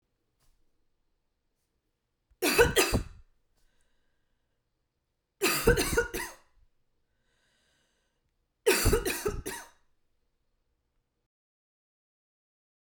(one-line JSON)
{"three_cough_length": "13.0 s", "three_cough_amplitude": 12747, "three_cough_signal_mean_std_ratio": 0.3, "survey_phase": "beta (2021-08-13 to 2022-03-07)", "age": "45-64", "gender": "Female", "wearing_mask": "No", "symptom_none": true, "smoker_status": "Ex-smoker", "respiratory_condition_asthma": false, "respiratory_condition_other": false, "recruitment_source": "REACT", "submission_delay": "2 days", "covid_test_result": "Negative", "covid_test_method": "RT-qPCR"}